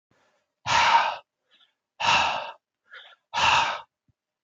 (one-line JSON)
{"exhalation_length": "4.4 s", "exhalation_amplitude": 13266, "exhalation_signal_mean_std_ratio": 0.46, "survey_phase": "beta (2021-08-13 to 2022-03-07)", "age": "45-64", "gender": "Male", "wearing_mask": "No", "symptom_none": true, "smoker_status": "Current smoker (1 to 10 cigarettes per day)", "respiratory_condition_asthma": false, "respiratory_condition_other": false, "recruitment_source": "REACT", "submission_delay": "1 day", "covid_test_result": "Negative", "covid_test_method": "RT-qPCR", "influenza_a_test_result": "Negative", "influenza_b_test_result": "Negative"}